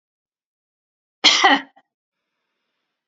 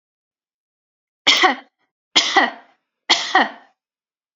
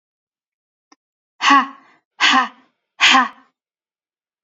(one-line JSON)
{"cough_length": "3.1 s", "cough_amplitude": 32001, "cough_signal_mean_std_ratio": 0.26, "three_cough_length": "4.4 s", "three_cough_amplitude": 32767, "three_cough_signal_mean_std_ratio": 0.35, "exhalation_length": "4.4 s", "exhalation_amplitude": 29827, "exhalation_signal_mean_std_ratio": 0.34, "survey_phase": "beta (2021-08-13 to 2022-03-07)", "age": "18-44", "gender": "Female", "wearing_mask": "No", "symptom_none": true, "smoker_status": "Never smoked", "respiratory_condition_asthma": false, "respiratory_condition_other": false, "recruitment_source": "REACT", "submission_delay": "1 day", "covid_test_result": "Negative", "covid_test_method": "RT-qPCR", "influenza_a_test_result": "Negative", "influenza_b_test_result": "Negative"}